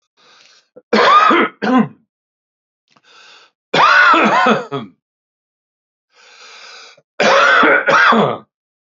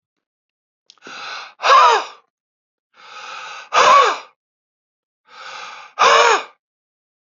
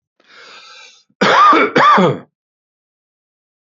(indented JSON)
{
  "three_cough_length": "8.9 s",
  "three_cough_amplitude": 30504,
  "three_cough_signal_mean_std_ratio": 0.51,
  "exhalation_length": "7.3 s",
  "exhalation_amplitude": 29418,
  "exhalation_signal_mean_std_ratio": 0.38,
  "cough_length": "3.8 s",
  "cough_amplitude": 29761,
  "cough_signal_mean_std_ratio": 0.44,
  "survey_phase": "beta (2021-08-13 to 2022-03-07)",
  "age": "45-64",
  "gender": "Male",
  "wearing_mask": "No",
  "symptom_runny_or_blocked_nose": true,
  "symptom_onset": "7 days",
  "smoker_status": "Ex-smoker",
  "respiratory_condition_asthma": true,
  "respiratory_condition_other": false,
  "recruitment_source": "Test and Trace",
  "submission_delay": "2 days",
  "covid_test_result": "Positive",
  "covid_test_method": "RT-qPCR",
  "covid_ct_value": 22.3,
  "covid_ct_gene": "ORF1ab gene",
  "covid_ct_mean": 23.0,
  "covid_viral_load": "28000 copies/ml",
  "covid_viral_load_category": "Low viral load (10K-1M copies/ml)"
}